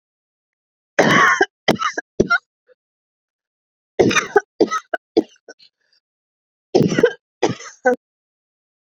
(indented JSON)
{
  "three_cough_length": "8.9 s",
  "three_cough_amplitude": 32768,
  "three_cough_signal_mean_std_ratio": 0.35,
  "survey_phase": "beta (2021-08-13 to 2022-03-07)",
  "age": "45-64",
  "gender": "Female",
  "wearing_mask": "No",
  "symptom_cough_any": true,
  "symptom_abdominal_pain": true,
  "symptom_diarrhoea": true,
  "symptom_onset": "10 days",
  "smoker_status": "Ex-smoker",
  "respiratory_condition_asthma": true,
  "respiratory_condition_other": true,
  "recruitment_source": "Test and Trace",
  "submission_delay": "1 day",
  "covid_test_result": "Positive",
  "covid_test_method": "RT-qPCR",
  "covid_ct_value": 19.5,
  "covid_ct_gene": "ORF1ab gene",
  "covid_ct_mean": 20.0,
  "covid_viral_load": "280000 copies/ml",
  "covid_viral_load_category": "Low viral load (10K-1M copies/ml)"
}